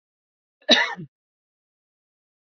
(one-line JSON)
{"cough_length": "2.5 s", "cough_amplitude": 28962, "cough_signal_mean_std_ratio": 0.22, "survey_phase": "beta (2021-08-13 to 2022-03-07)", "age": "18-44", "gender": "Female", "wearing_mask": "No", "symptom_none": true, "smoker_status": "Ex-smoker", "respiratory_condition_asthma": false, "respiratory_condition_other": false, "recruitment_source": "REACT", "submission_delay": "2 days", "covid_test_result": "Negative", "covid_test_method": "RT-qPCR"}